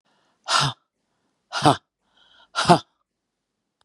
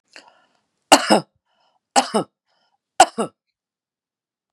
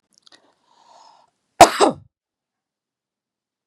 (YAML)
exhalation_length: 3.8 s
exhalation_amplitude: 32487
exhalation_signal_mean_std_ratio: 0.27
three_cough_length: 4.5 s
three_cough_amplitude: 32768
three_cough_signal_mean_std_ratio: 0.23
cough_length: 3.7 s
cough_amplitude: 32768
cough_signal_mean_std_ratio: 0.17
survey_phase: beta (2021-08-13 to 2022-03-07)
age: 65+
gender: Female
wearing_mask: 'No'
symptom_none: true
smoker_status: Never smoked
respiratory_condition_asthma: false
respiratory_condition_other: false
recruitment_source: REACT
submission_delay: 1 day
covid_test_result: Positive
covid_test_method: RT-qPCR
covid_ct_value: 36.8
covid_ct_gene: N gene
influenza_a_test_result: Negative
influenza_b_test_result: Negative